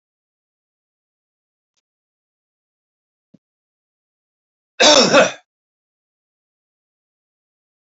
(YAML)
cough_length: 7.9 s
cough_amplitude: 31740
cough_signal_mean_std_ratio: 0.19
survey_phase: beta (2021-08-13 to 2022-03-07)
age: 45-64
gender: Male
wearing_mask: 'No'
symptom_none: true
smoker_status: Never smoked
respiratory_condition_asthma: false
respiratory_condition_other: false
recruitment_source: REACT
submission_delay: 2 days
covid_test_result: Negative
covid_test_method: RT-qPCR
influenza_a_test_result: Negative
influenza_b_test_result: Negative